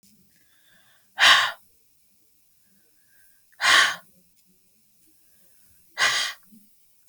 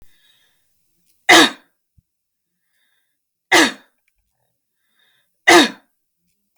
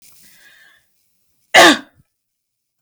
{"exhalation_length": "7.1 s", "exhalation_amplitude": 24808, "exhalation_signal_mean_std_ratio": 0.29, "three_cough_length": "6.6 s", "three_cough_amplitude": 32768, "three_cough_signal_mean_std_ratio": 0.25, "cough_length": "2.8 s", "cough_amplitude": 32768, "cough_signal_mean_std_ratio": 0.25, "survey_phase": "beta (2021-08-13 to 2022-03-07)", "age": "45-64", "gender": "Female", "wearing_mask": "No", "symptom_none": true, "smoker_status": "Ex-smoker", "respiratory_condition_asthma": false, "respiratory_condition_other": false, "recruitment_source": "REACT", "submission_delay": "1 day", "covid_test_result": "Negative", "covid_test_method": "RT-qPCR", "influenza_a_test_result": "Negative", "influenza_b_test_result": "Negative"}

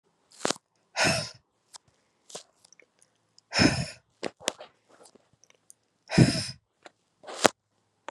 {"exhalation_length": "8.1 s", "exhalation_amplitude": 32767, "exhalation_signal_mean_std_ratio": 0.26, "survey_phase": "beta (2021-08-13 to 2022-03-07)", "age": "45-64", "gender": "Female", "wearing_mask": "No", "symptom_new_continuous_cough": true, "symptom_onset": "5 days", "smoker_status": "Never smoked", "respiratory_condition_asthma": false, "respiratory_condition_other": false, "recruitment_source": "Test and Trace", "submission_delay": "2 days", "covid_test_result": "Positive", "covid_test_method": "RT-qPCR", "covid_ct_value": 12.3, "covid_ct_gene": "ORF1ab gene", "covid_ct_mean": 12.7, "covid_viral_load": "68000000 copies/ml", "covid_viral_load_category": "High viral load (>1M copies/ml)"}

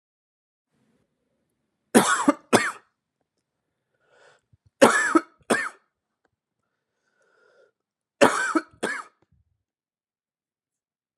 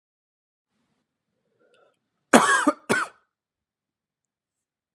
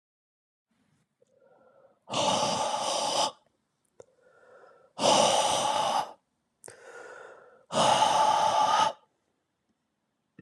{"three_cough_length": "11.2 s", "three_cough_amplitude": 31130, "three_cough_signal_mean_std_ratio": 0.26, "cough_length": "4.9 s", "cough_amplitude": 32681, "cough_signal_mean_std_ratio": 0.23, "exhalation_length": "10.4 s", "exhalation_amplitude": 10394, "exhalation_signal_mean_std_ratio": 0.51, "survey_phase": "beta (2021-08-13 to 2022-03-07)", "age": "18-44", "gender": "Male", "wearing_mask": "No", "symptom_cough_any": true, "symptom_fatigue": true, "smoker_status": "Never smoked", "respiratory_condition_asthma": false, "respiratory_condition_other": false, "recruitment_source": "Test and Trace", "submission_delay": "1 day", "covid_test_result": "Negative", "covid_test_method": "RT-qPCR"}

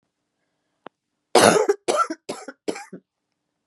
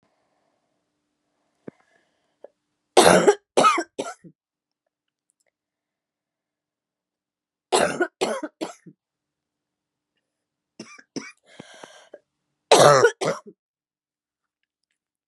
{"cough_length": "3.7 s", "cough_amplitude": 31794, "cough_signal_mean_std_ratio": 0.32, "three_cough_length": "15.3 s", "three_cough_amplitude": 32013, "three_cough_signal_mean_std_ratio": 0.25, "survey_phase": "beta (2021-08-13 to 2022-03-07)", "age": "18-44", "gender": "Female", "wearing_mask": "No", "symptom_cough_any": true, "symptom_runny_or_blocked_nose": true, "symptom_shortness_of_breath": true, "symptom_sore_throat": true, "symptom_fatigue": true, "symptom_fever_high_temperature": true, "symptom_headache": true, "symptom_onset": "6 days", "smoker_status": "Never smoked", "respiratory_condition_asthma": false, "respiratory_condition_other": false, "recruitment_source": "Test and Trace", "submission_delay": "2 days", "covid_test_result": "Negative", "covid_test_method": "RT-qPCR"}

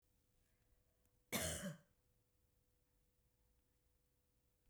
{"cough_length": "4.7 s", "cough_amplitude": 1417, "cough_signal_mean_std_ratio": 0.27, "survey_phase": "beta (2021-08-13 to 2022-03-07)", "age": "45-64", "gender": "Female", "wearing_mask": "No", "symptom_none": true, "smoker_status": "Never smoked", "respiratory_condition_asthma": false, "respiratory_condition_other": false, "recruitment_source": "REACT", "submission_delay": "3 days", "covid_test_result": "Negative", "covid_test_method": "RT-qPCR", "influenza_a_test_result": "Negative", "influenza_b_test_result": "Negative"}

